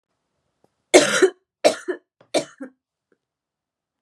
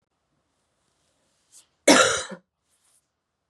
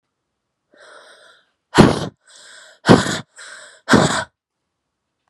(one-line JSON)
{"three_cough_length": "4.0 s", "three_cough_amplitude": 32768, "three_cough_signal_mean_std_ratio": 0.27, "cough_length": "3.5 s", "cough_amplitude": 27064, "cough_signal_mean_std_ratio": 0.23, "exhalation_length": "5.3 s", "exhalation_amplitude": 32768, "exhalation_signal_mean_std_ratio": 0.3, "survey_phase": "beta (2021-08-13 to 2022-03-07)", "age": "18-44", "gender": "Female", "wearing_mask": "No", "symptom_cough_any": true, "symptom_runny_or_blocked_nose": true, "symptom_sore_throat": true, "symptom_fatigue": true, "symptom_fever_high_temperature": true, "symptom_headache": true, "symptom_other": true, "symptom_onset": "6 days", "smoker_status": "Never smoked", "respiratory_condition_asthma": false, "respiratory_condition_other": false, "recruitment_source": "Test and Trace", "submission_delay": "2 days", "covid_test_result": "Positive", "covid_test_method": "RT-qPCR", "covid_ct_value": 16.9, "covid_ct_gene": "ORF1ab gene"}